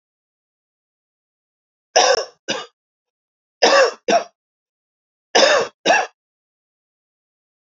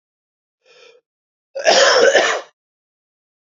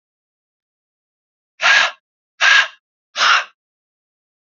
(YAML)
three_cough_length: 7.8 s
three_cough_amplitude: 32768
three_cough_signal_mean_std_ratio: 0.32
cough_length: 3.6 s
cough_amplitude: 31382
cough_signal_mean_std_ratio: 0.38
exhalation_length: 4.5 s
exhalation_amplitude: 32313
exhalation_signal_mean_std_ratio: 0.34
survey_phase: beta (2021-08-13 to 2022-03-07)
age: 18-44
gender: Male
wearing_mask: 'No'
symptom_cough_any: true
symptom_runny_or_blocked_nose: true
symptom_shortness_of_breath: true
symptom_sore_throat: true
symptom_fatigue: true
symptom_fever_high_temperature: true
symptom_other: true
smoker_status: Never smoked
respiratory_condition_asthma: false
respiratory_condition_other: false
recruitment_source: Test and Trace
submission_delay: 1 day
covid_test_result: Positive
covid_test_method: RT-qPCR